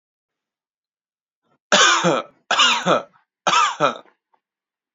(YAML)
three_cough_length: 4.9 s
three_cough_amplitude: 27091
three_cough_signal_mean_std_ratio: 0.42
survey_phase: beta (2021-08-13 to 2022-03-07)
age: 18-44
gender: Male
wearing_mask: 'No'
symptom_fatigue: true
symptom_fever_high_temperature: true
symptom_headache: true
symptom_onset: 3 days
smoker_status: Never smoked
respiratory_condition_asthma: false
respiratory_condition_other: false
recruitment_source: Test and Trace
submission_delay: 1 day
covid_test_result: Positive
covid_test_method: RT-qPCR
covid_ct_value: 24.2
covid_ct_gene: ORF1ab gene
covid_ct_mean: 26.8
covid_viral_load: 1600 copies/ml
covid_viral_load_category: Minimal viral load (< 10K copies/ml)